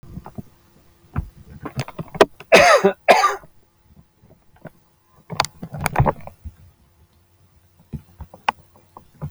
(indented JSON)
{
  "cough_length": "9.3 s",
  "cough_amplitude": 32768,
  "cough_signal_mean_std_ratio": 0.3,
  "survey_phase": "alpha (2021-03-01 to 2021-08-12)",
  "age": "45-64",
  "gender": "Male",
  "wearing_mask": "No",
  "symptom_none": true,
  "smoker_status": "Never smoked",
  "respiratory_condition_asthma": false,
  "respiratory_condition_other": false,
  "recruitment_source": "REACT",
  "submission_delay": "2 days",
  "covid_test_result": "Negative",
  "covid_test_method": "RT-qPCR"
}